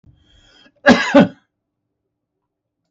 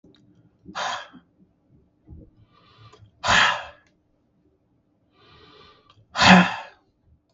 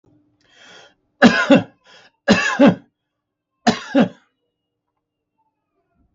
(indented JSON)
{
  "cough_length": "2.9 s",
  "cough_amplitude": 32768,
  "cough_signal_mean_std_ratio": 0.27,
  "exhalation_length": "7.3 s",
  "exhalation_amplitude": 32768,
  "exhalation_signal_mean_std_ratio": 0.27,
  "three_cough_length": "6.1 s",
  "three_cough_amplitude": 32768,
  "three_cough_signal_mean_std_ratio": 0.31,
  "survey_phase": "beta (2021-08-13 to 2022-03-07)",
  "age": "65+",
  "gender": "Male",
  "wearing_mask": "No",
  "symptom_none": true,
  "smoker_status": "Never smoked",
  "respiratory_condition_asthma": false,
  "respiratory_condition_other": false,
  "recruitment_source": "REACT",
  "submission_delay": "1 day",
  "covid_test_result": "Negative",
  "covid_test_method": "RT-qPCR"
}